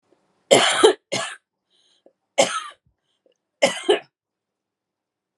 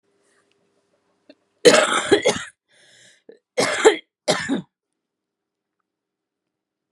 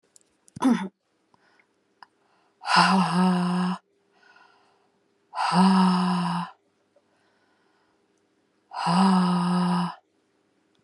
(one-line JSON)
{"three_cough_length": "5.4 s", "three_cough_amplitude": 32767, "three_cough_signal_mean_std_ratio": 0.31, "cough_length": "6.9 s", "cough_amplitude": 32768, "cough_signal_mean_std_ratio": 0.3, "exhalation_length": "10.8 s", "exhalation_amplitude": 18580, "exhalation_signal_mean_std_ratio": 0.51, "survey_phase": "beta (2021-08-13 to 2022-03-07)", "age": "45-64", "gender": "Female", "wearing_mask": "No", "symptom_cough_any": true, "symptom_shortness_of_breath": true, "symptom_sore_throat": true, "symptom_diarrhoea": true, "symptom_fatigue": true, "symptom_fever_high_temperature": true, "symptom_headache": true, "symptom_change_to_sense_of_smell_or_taste": true, "symptom_loss_of_taste": true, "symptom_onset": "8 days", "smoker_status": "Ex-smoker", "respiratory_condition_asthma": false, "respiratory_condition_other": false, "recruitment_source": "Test and Trace", "submission_delay": "1 day", "covid_test_result": "Positive", "covid_test_method": "RT-qPCR", "covid_ct_value": 21.4, "covid_ct_gene": "ORF1ab gene", "covid_ct_mean": 22.2, "covid_viral_load": "54000 copies/ml", "covid_viral_load_category": "Low viral load (10K-1M copies/ml)"}